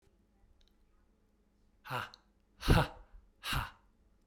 {"exhalation_length": "4.3 s", "exhalation_amplitude": 7408, "exhalation_signal_mean_std_ratio": 0.28, "survey_phase": "beta (2021-08-13 to 2022-03-07)", "age": "18-44", "gender": "Male", "wearing_mask": "No", "symptom_cough_any": true, "smoker_status": "Never smoked", "respiratory_condition_asthma": false, "respiratory_condition_other": false, "recruitment_source": "REACT", "submission_delay": "1 day", "covid_test_result": "Negative", "covid_test_method": "RT-qPCR", "influenza_a_test_result": "Negative", "influenza_b_test_result": "Negative"}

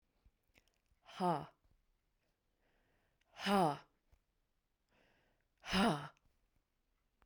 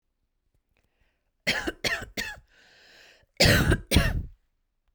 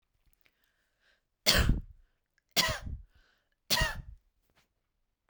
{"exhalation_length": "7.3 s", "exhalation_amplitude": 3516, "exhalation_signal_mean_std_ratio": 0.28, "cough_length": "4.9 s", "cough_amplitude": 17672, "cough_signal_mean_std_ratio": 0.38, "three_cough_length": "5.3 s", "three_cough_amplitude": 16260, "three_cough_signal_mean_std_ratio": 0.32, "survey_phase": "beta (2021-08-13 to 2022-03-07)", "age": "18-44", "gender": "Female", "wearing_mask": "No", "symptom_change_to_sense_of_smell_or_taste": true, "smoker_status": "Never smoked", "respiratory_condition_asthma": false, "respiratory_condition_other": false, "recruitment_source": "REACT", "submission_delay": "0 days", "covid_test_result": "Negative", "covid_test_method": "RT-qPCR"}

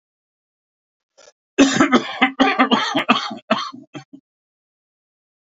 {"cough_length": "5.5 s", "cough_amplitude": 32767, "cough_signal_mean_std_ratio": 0.41, "survey_phase": "beta (2021-08-13 to 2022-03-07)", "age": "65+", "gender": "Male", "wearing_mask": "No", "symptom_cough_any": true, "symptom_runny_or_blocked_nose": true, "smoker_status": "Never smoked", "respiratory_condition_asthma": false, "respiratory_condition_other": false, "recruitment_source": "REACT", "submission_delay": "1 day", "covid_test_result": "Negative", "covid_test_method": "RT-qPCR", "influenza_a_test_result": "Negative", "influenza_b_test_result": "Negative"}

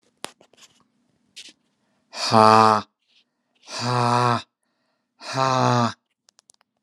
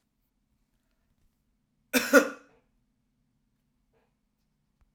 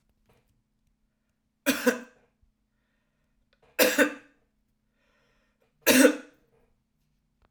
{"exhalation_length": "6.8 s", "exhalation_amplitude": 31385, "exhalation_signal_mean_std_ratio": 0.36, "cough_length": "4.9 s", "cough_amplitude": 19877, "cough_signal_mean_std_ratio": 0.17, "three_cough_length": "7.5 s", "three_cough_amplitude": 18907, "three_cough_signal_mean_std_ratio": 0.25, "survey_phase": "alpha (2021-03-01 to 2021-08-12)", "age": "45-64", "gender": "Male", "wearing_mask": "No", "symptom_none": true, "smoker_status": "Never smoked", "respiratory_condition_asthma": false, "respiratory_condition_other": false, "recruitment_source": "REACT", "submission_delay": "1 day", "covid_test_result": "Negative", "covid_test_method": "RT-qPCR"}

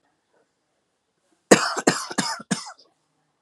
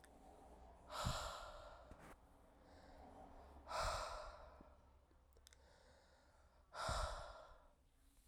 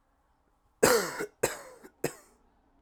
{"cough_length": "3.4 s", "cough_amplitude": 32768, "cough_signal_mean_std_ratio": 0.28, "exhalation_length": "8.3 s", "exhalation_amplitude": 1005, "exhalation_signal_mean_std_ratio": 0.54, "three_cough_length": "2.8 s", "three_cough_amplitude": 16479, "three_cough_signal_mean_std_ratio": 0.33, "survey_phase": "alpha (2021-03-01 to 2021-08-12)", "age": "18-44", "gender": "Male", "wearing_mask": "No", "symptom_none": true, "symptom_onset": "12 days", "smoker_status": "Never smoked", "respiratory_condition_asthma": false, "respiratory_condition_other": false, "recruitment_source": "REACT", "submission_delay": "1 day", "covid_test_result": "Negative", "covid_test_method": "RT-qPCR"}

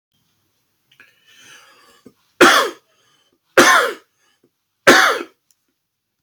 {"three_cough_length": "6.2 s", "three_cough_amplitude": 32767, "three_cough_signal_mean_std_ratio": 0.31, "survey_phase": "alpha (2021-03-01 to 2021-08-12)", "age": "45-64", "gender": "Male", "wearing_mask": "No", "symptom_none": true, "symptom_onset": "12 days", "smoker_status": "Never smoked", "respiratory_condition_asthma": false, "respiratory_condition_other": false, "recruitment_source": "REACT", "submission_delay": "1 day", "covid_test_result": "Negative", "covid_test_method": "RT-qPCR"}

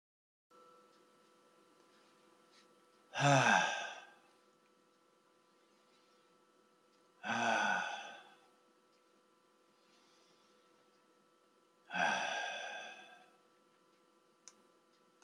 {"exhalation_length": "15.2 s", "exhalation_amplitude": 5204, "exhalation_signal_mean_std_ratio": 0.32, "survey_phase": "beta (2021-08-13 to 2022-03-07)", "age": "65+", "gender": "Male", "wearing_mask": "No", "symptom_none": true, "smoker_status": "Ex-smoker", "respiratory_condition_asthma": false, "respiratory_condition_other": false, "recruitment_source": "REACT", "submission_delay": "2 days", "covid_test_result": "Negative", "covid_test_method": "RT-qPCR", "influenza_a_test_result": "Negative", "influenza_b_test_result": "Negative"}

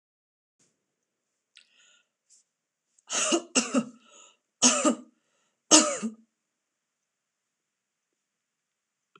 {"three_cough_length": "9.2 s", "three_cough_amplitude": 24485, "three_cough_signal_mean_std_ratio": 0.26, "survey_phase": "beta (2021-08-13 to 2022-03-07)", "age": "65+", "gender": "Female", "wearing_mask": "No", "symptom_none": true, "smoker_status": "Never smoked", "respiratory_condition_asthma": false, "respiratory_condition_other": false, "recruitment_source": "REACT", "submission_delay": "2 days", "covid_test_result": "Negative", "covid_test_method": "RT-qPCR"}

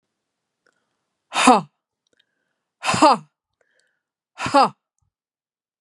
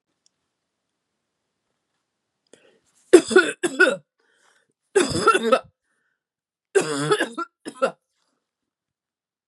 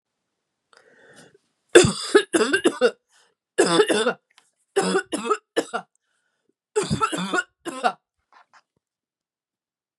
{"exhalation_length": "5.8 s", "exhalation_amplitude": 32767, "exhalation_signal_mean_std_ratio": 0.27, "three_cough_length": "9.5 s", "three_cough_amplitude": 32768, "three_cough_signal_mean_std_ratio": 0.29, "cough_length": "10.0 s", "cough_amplitude": 32767, "cough_signal_mean_std_ratio": 0.37, "survey_phase": "beta (2021-08-13 to 2022-03-07)", "age": "45-64", "gender": "Female", "wearing_mask": "No", "symptom_none": true, "smoker_status": "Never smoked", "respiratory_condition_asthma": false, "respiratory_condition_other": false, "recruitment_source": "REACT", "submission_delay": "2 days", "covid_test_result": "Negative", "covid_test_method": "RT-qPCR", "influenza_a_test_result": "Negative", "influenza_b_test_result": "Negative"}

